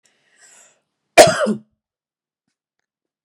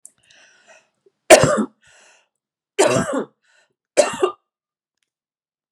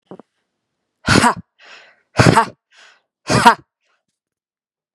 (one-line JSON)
{"cough_length": "3.2 s", "cough_amplitude": 32768, "cough_signal_mean_std_ratio": 0.22, "three_cough_length": "5.7 s", "three_cough_amplitude": 32768, "three_cough_signal_mean_std_ratio": 0.29, "exhalation_length": "4.9 s", "exhalation_amplitude": 32768, "exhalation_signal_mean_std_ratio": 0.31, "survey_phase": "beta (2021-08-13 to 2022-03-07)", "age": "45-64", "gender": "Female", "wearing_mask": "No", "symptom_none": true, "smoker_status": "Never smoked", "respiratory_condition_asthma": false, "respiratory_condition_other": false, "recruitment_source": "REACT", "submission_delay": "1 day", "covid_test_result": "Negative", "covid_test_method": "RT-qPCR"}